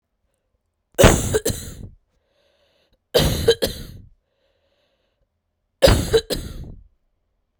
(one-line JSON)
{"three_cough_length": "7.6 s", "three_cough_amplitude": 32768, "three_cough_signal_mean_std_ratio": 0.34, "survey_phase": "beta (2021-08-13 to 2022-03-07)", "age": "18-44", "gender": "Female", "wearing_mask": "No", "symptom_runny_or_blocked_nose": true, "symptom_sore_throat": true, "symptom_fatigue": true, "symptom_fever_high_temperature": true, "symptom_headache": true, "symptom_change_to_sense_of_smell_or_taste": true, "symptom_loss_of_taste": true, "symptom_onset": "3 days", "smoker_status": "Current smoker (e-cigarettes or vapes only)", "respiratory_condition_asthma": false, "respiratory_condition_other": false, "recruitment_source": "Test and Trace", "submission_delay": "2 days", "covid_test_result": "Positive", "covid_test_method": "RT-qPCR", "covid_ct_value": 28.6, "covid_ct_gene": "ORF1ab gene", "covid_ct_mean": 29.5, "covid_viral_load": "210 copies/ml", "covid_viral_load_category": "Minimal viral load (< 10K copies/ml)"}